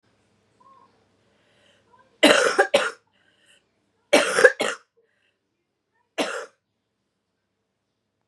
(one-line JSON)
{"three_cough_length": "8.3 s", "three_cough_amplitude": 32768, "three_cough_signal_mean_std_ratio": 0.27, "survey_phase": "beta (2021-08-13 to 2022-03-07)", "age": "18-44", "gender": "Female", "wearing_mask": "No", "symptom_cough_any": true, "symptom_runny_or_blocked_nose": true, "symptom_sore_throat": true, "symptom_fatigue": true, "symptom_fever_high_temperature": true, "symptom_change_to_sense_of_smell_or_taste": true, "symptom_loss_of_taste": true, "symptom_onset": "3 days", "smoker_status": "Never smoked", "respiratory_condition_asthma": false, "respiratory_condition_other": false, "recruitment_source": "Test and Trace", "submission_delay": "2 days", "covid_test_result": "Positive", "covid_test_method": "RT-qPCR", "covid_ct_value": 33.8, "covid_ct_gene": "N gene"}